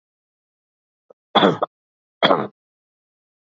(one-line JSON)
{"cough_length": "3.5 s", "cough_amplitude": 27888, "cough_signal_mean_std_ratio": 0.26, "survey_phase": "beta (2021-08-13 to 2022-03-07)", "age": "45-64", "gender": "Male", "wearing_mask": "No", "symptom_sore_throat": true, "smoker_status": "Ex-smoker", "respiratory_condition_asthma": false, "respiratory_condition_other": false, "recruitment_source": "Test and Trace", "submission_delay": "2 days", "covid_test_result": "Positive", "covid_test_method": "ePCR"}